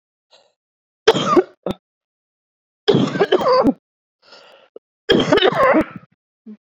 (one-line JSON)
{"three_cough_length": "6.7 s", "three_cough_amplitude": 30578, "three_cough_signal_mean_std_ratio": 0.43, "survey_phase": "beta (2021-08-13 to 2022-03-07)", "age": "18-44", "gender": "Female", "wearing_mask": "No", "symptom_cough_any": true, "symptom_shortness_of_breath": true, "symptom_sore_throat": true, "symptom_abdominal_pain": true, "symptom_fever_high_temperature": true, "symptom_headache": true, "symptom_onset": "2 days", "smoker_status": "Never smoked", "respiratory_condition_asthma": true, "respiratory_condition_other": false, "recruitment_source": "Test and Trace", "submission_delay": "1 day", "covid_test_result": "Positive", "covid_test_method": "RT-qPCR", "covid_ct_value": 24.8, "covid_ct_gene": "ORF1ab gene"}